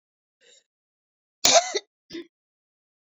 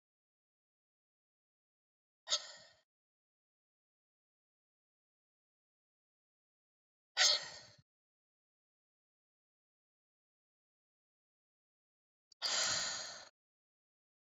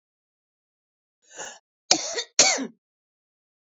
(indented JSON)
{
  "cough_length": "3.1 s",
  "cough_amplitude": 26822,
  "cough_signal_mean_std_ratio": 0.23,
  "exhalation_length": "14.3 s",
  "exhalation_amplitude": 4548,
  "exhalation_signal_mean_std_ratio": 0.2,
  "three_cough_length": "3.8 s",
  "three_cough_amplitude": 27532,
  "three_cough_signal_mean_std_ratio": 0.26,
  "survey_phase": "beta (2021-08-13 to 2022-03-07)",
  "age": "45-64",
  "gender": "Female",
  "wearing_mask": "No",
  "symptom_none": true,
  "smoker_status": "Ex-smoker",
  "respiratory_condition_asthma": false,
  "respiratory_condition_other": false,
  "recruitment_source": "REACT",
  "submission_delay": "2 days",
  "covid_test_result": "Negative",
  "covid_test_method": "RT-qPCR",
  "influenza_a_test_result": "Unknown/Void",
  "influenza_b_test_result": "Unknown/Void"
}